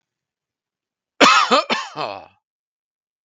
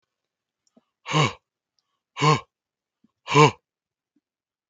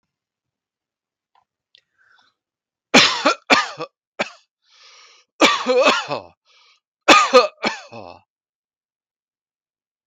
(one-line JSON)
{"cough_length": "3.2 s", "cough_amplitude": 32768, "cough_signal_mean_std_ratio": 0.34, "exhalation_length": "4.7 s", "exhalation_amplitude": 29300, "exhalation_signal_mean_std_ratio": 0.26, "three_cough_length": "10.1 s", "three_cough_amplitude": 32768, "three_cough_signal_mean_std_ratio": 0.31, "survey_phase": "beta (2021-08-13 to 2022-03-07)", "age": "18-44", "gender": "Male", "wearing_mask": "No", "symptom_none": true, "smoker_status": "Never smoked", "respiratory_condition_asthma": false, "respiratory_condition_other": false, "recruitment_source": "REACT", "submission_delay": "1 day", "covid_test_result": "Negative", "covid_test_method": "RT-qPCR"}